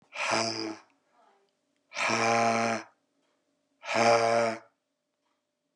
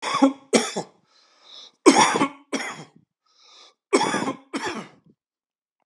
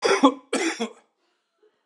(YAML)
exhalation_length: 5.8 s
exhalation_amplitude: 9555
exhalation_signal_mean_std_ratio: 0.5
three_cough_length: 5.9 s
three_cough_amplitude: 32768
three_cough_signal_mean_std_ratio: 0.38
cough_length: 1.9 s
cough_amplitude: 24432
cough_signal_mean_std_ratio: 0.42
survey_phase: beta (2021-08-13 to 2022-03-07)
age: 65+
gender: Male
wearing_mask: 'No'
symptom_cough_any: true
symptom_runny_or_blocked_nose: true
symptom_headache: true
smoker_status: Never smoked
respiratory_condition_asthma: false
respiratory_condition_other: false
recruitment_source: Test and Trace
submission_delay: 2 days
covid_test_result: Positive
covid_test_method: RT-qPCR